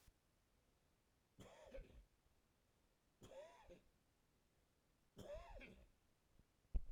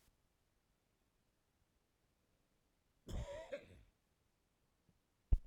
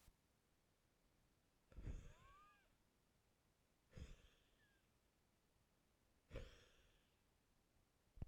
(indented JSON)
{
  "three_cough_length": "6.9 s",
  "three_cough_amplitude": 990,
  "three_cough_signal_mean_std_ratio": 0.31,
  "cough_length": "5.5 s",
  "cough_amplitude": 2689,
  "cough_signal_mean_std_ratio": 0.18,
  "exhalation_length": "8.3 s",
  "exhalation_amplitude": 338,
  "exhalation_signal_mean_std_ratio": 0.37,
  "survey_phase": "beta (2021-08-13 to 2022-03-07)",
  "age": "65+",
  "gender": "Male",
  "wearing_mask": "No",
  "symptom_cough_any": true,
  "symptom_runny_or_blocked_nose": true,
  "symptom_sore_throat": true,
  "symptom_fatigue": true,
  "symptom_headache": true,
  "symptom_onset": "3 days",
  "smoker_status": "Ex-smoker",
  "respiratory_condition_asthma": false,
  "respiratory_condition_other": false,
  "recruitment_source": "Test and Trace",
  "submission_delay": "2 days",
  "covid_test_result": "Positive",
  "covid_test_method": "RT-qPCR",
  "covid_ct_value": 15.4,
  "covid_ct_gene": "ORF1ab gene",
  "covid_ct_mean": 15.9,
  "covid_viral_load": "6200000 copies/ml",
  "covid_viral_load_category": "High viral load (>1M copies/ml)"
}